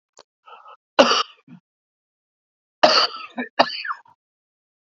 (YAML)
cough_length: 4.9 s
cough_amplitude: 32767
cough_signal_mean_std_ratio: 0.3
survey_phase: alpha (2021-03-01 to 2021-08-12)
age: 45-64
gender: Male
wearing_mask: 'No'
symptom_none: true
smoker_status: Ex-smoker
respiratory_condition_asthma: false
respiratory_condition_other: false
recruitment_source: REACT
submission_delay: 2 days
covid_test_result: Negative
covid_test_method: RT-qPCR